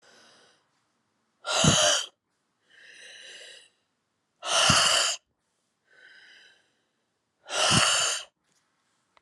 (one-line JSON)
{"exhalation_length": "9.2 s", "exhalation_amplitude": 15967, "exhalation_signal_mean_std_ratio": 0.39, "survey_phase": "alpha (2021-03-01 to 2021-08-12)", "age": "18-44", "gender": "Female", "wearing_mask": "No", "symptom_cough_any": true, "symptom_fatigue": true, "symptom_onset": "3 days", "smoker_status": "Current smoker (e-cigarettes or vapes only)", "respiratory_condition_asthma": true, "respiratory_condition_other": false, "recruitment_source": "Test and Trace", "submission_delay": "2 days", "covid_test_result": "Positive", "covid_test_method": "RT-qPCR", "covid_ct_value": 16.4, "covid_ct_gene": "ORF1ab gene", "covid_ct_mean": 17.0, "covid_viral_load": "2800000 copies/ml", "covid_viral_load_category": "High viral load (>1M copies/ml)"}